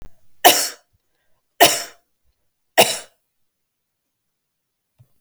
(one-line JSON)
{"three_cough_length": "5.2 s", "three_cough_amplitude": 32768, "three_cough_signal_mean_std_ratio": 0.25, "survey_phase": "beta (2021-08-13 to 2022-03-07)", "age": "45-64", "gender": "Female", "wearing_mask": "No", "symptom_none": true, "smoker_status": "Never smoked", "respiratory_condition_asthma": false, "respiratory_condition_other": false, "recruitment_source": "REACT", "submission_delay": "2 days", "covid_test_result": "Negative", "covid_test_method": "RT-qPCR", "influenza_a_test_result": "Negative", "influenza_b_test_result": "Negative"}